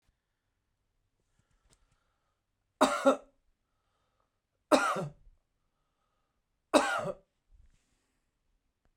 three_cough_length: 9.0 s
three_cough_amplitude: 13911
three_cough_signal_mean_std_ratio: 0.24
survey_phase: beta (2021-08-13 to 2022-03-07)
age: 45-64
gender: Male
wearing_mask: 'No'
symptom_fatigue: true
symptom_headache: true
smoker_status: Never smoked
respiratory_condition_asthma: false
respiratory_condition_other: false
recruitment_source: REACT
submission_delay: 2 days
covid_test_result: Negative
covid_test_method: RT-qPCR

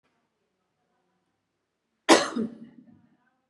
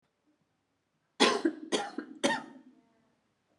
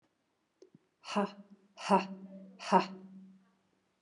cough_length: 3.5 s
cough_amplitude: 24593
cough_signal_mean_std_ratio: 0.21
three_cough_length: 3.6 s
three_cough_amplitude: 10225
three_cough_signal_mean_std_ratio: 0.34
exhalation_length: 4.0 s
exhalation_amplitude: 10073
exhalation_signal_mean_std_ratio: 0.31
survey_phase: beta (2021-08-13 to 2022-03-07)
age: 18-44
gender: Female
wearing_mask: 'No'
symptom_none: true
smoker_status: Ex-smoker
respiratory_condition_asthma: false
respiratory_condition_other: false
recruitment_source: REACT
submission_delay: 1 day
covid_test_result: Negative
covid_test_method: RT-qPCR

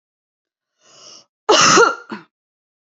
cough_length: 2.9 s
cough_amplitude: 30279
cough_signal_mean_std_ratio: 0.34
survey_phase: alpha (2021-03-01 to 2021-08-12)
age: 18-44
gender: Female
wearing_mask: 'No'
symptom_none: true
symptom_onset: 12 days
smoker_status: Never smoked
respiratory_condition_asthma: false
respiratory_condition_other: false
recruitment_source: REACT
submission_delay: 2 days
covid_test_result: Negative
covid_test_method: RT-qPCR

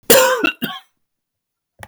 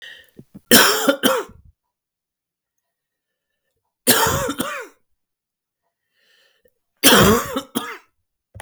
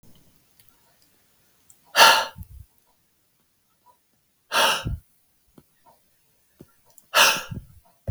cough_length: 1.9 s
cough_amplitude: 32768
cough_signal_mean_std_ratio: 0.4
three_cough_length: 8.6 s
three_cough_amplitude: 32768
three_cough_signal_mean_std_ratio: 0.35
exhalation_length: 8.1 s
exhalation_amplitude: 32768
exhalation_signal_mean_std_ratio: 0.27
survey_phase: beta (2021-08-13 to 2022-03-07)
age: 18-44
gender: Male
wearing_mask: 'No'
symptom_none: true
symptom_onset: 6 days
smoker_status: Never smoked
respiratory_condition_asthma: false
respiratory_condition_other: false
recruitment_source: REACT
submission_delay: 1 day
covid_test_result: Negative
covid_test_method: RT-qPCR
influenza_a_test_result: Negative
influenza_b_test_result: Negative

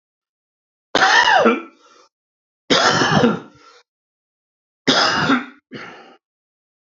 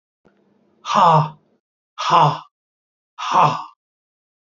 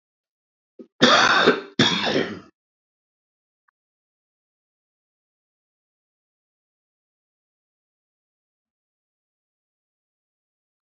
three_cough_length: 6.9 s
three_cough_amplitude: 28865
three_cough_signal_mean_std_ratio: 0.44
exhalation_length: 4.5 s
exhalation_amplitude: 26698
exhalation_signal_mean_std_ratio: 0.39
cough_length: 10.8 s
cough_amplitude: 27440
cough_signal_mean_std_ratio: 0.24
survey_phase: alpha (2021-03-01 to 2021-08-12)
age: 45-64
gender: Male
wearing_mask: 'No'
symptom_cough_any: true
symptom_onset: 12 days
smoker_status: Ex-smoker
respiratory_condition_asthma: true
respiratory_condition_other: false
recruitment_source: REACT
submission_delay: 2 days
covid_test_result: Negative
covid_test_method: RT-qPCR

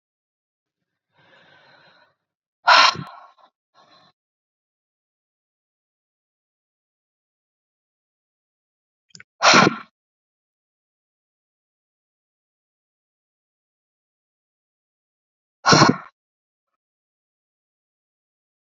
exhalation_length: 18.6 s
exhalation_amplitude: 30441
exhalation_signal_mean_std_ratio: 0.17
survey_phase: beta (2021-08-13 to 2022-03-07)
age: 45-64
gender: Female
wearing_mask: 'No'
symptom_none: true
smoker_status: Current smoker (11 or more cigarettes per day)
respiratory_condition_asthma: true
respiratory_condition_other: false
recruitment_source: REACT
submission_delay: 5 days
covid_test_result: Negative
covid_test_method: RT-qPCR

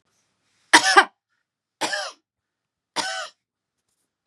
three_cough_length: 4.3 s
three_cough_amplitude: 32768
three_cough_signal_mean_std_ratio: 0.25
survey_phase: beta (2021-08-13 to 2022-03-07)
age: 45-64
gender: Female
wearing_mask: 'No'
symptom_none: true
smoker_status: Never smoked
respiratory_condition_asthma: false
respiratory_condition_other: false
recruitment_source: REACT
submission_delay: 1 day
covid_test_result: Negative
covid_test_method: RT-qPCR
influenza_a_test_result: Negative
influenza_b_test_result: Negative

